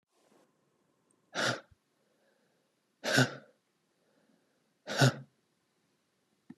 {"exhalation_length": "6.6 s", "exhalation_amplitude": 8541, "exhalation_signal_mean_std_ratio": 0.25, "survey_phase": "beta (2021-08-13 to 2022-03-07)", "age": "18-44", "gender": "Male", "wearing_mask": "No", "symptom_none": true, "smoker_status": "Ex-smoker", "recruitment_source": "Test and Trace", "submission_delay": "4 days", "covid_test_result": "Negative", "covid_test_method": "RT-qPCR"}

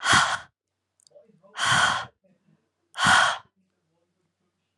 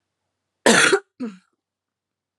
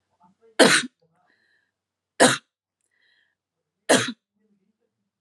{"exhalation_length": "4.8 s", "exhalation_amplitude": 17937, "exhalation_signal_mean_std_ratio": 0.4, "cough_length": "2.4 s", "cough_amplitude": 30962, "cough_signal_mean_std_ratio": 0.31, "three_cough_length": "5.2 s", "three_cough_amplitude": 31437, "three_cough_signal_mean_std_ratio": 0.25, "survey_phase": "alpha (2021-03-01 to 2021-08-12)", "age": "18-44", "gender": "Female", "wearing_mask": "No", "symptom_fatigue": true, "symptom_fever_high_temperature": true, "symptom_headache": true, "smoker_status": "Never smoked", "respiratory_condition_asthma": false, "respiratory_condition_other": false, "recruitment_source": "Test and Trace", "submission_delay": "1 day", "covid_test_result": "Positive", "covid_test_method": "RT-qPCR"}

